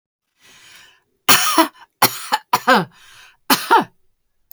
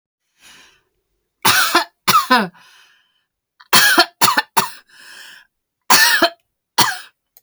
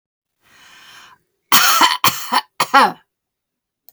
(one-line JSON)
{"cough_length": "4.5 s", "cough_amplitude": 32768, "cough_signal_mean_std_ratio": 0.38, "three_cough_length": "7.4 s", "three_cough_amplitude": 32768, "three_cough_signal_mean_std_ratio": 0.41, "exhalation_length": "3.9 s", "exhalation_amplitude": 32768, "exhalation_signal_mean_std_ratio": 0.39, "survey_phase": "beta (2021-08-13 to 2022-03-07)", "age": "45-64", "gender": "Female", "wearing_mask": "No", "symptom_diarrhoea": true, "symptom_fatigue": true, "symptom_headache": true, "symptom_other": true, "symptom_onset": "12 days", "smoker_status": "Never smoked", "respiratory_condition_asthma": true, "respiratory_condition_other": false, "recruitment_source": "REACT", "submission_delay": "2 days", "covid_test_result": "Negative", "covid_test_method": "RT-qPCR"}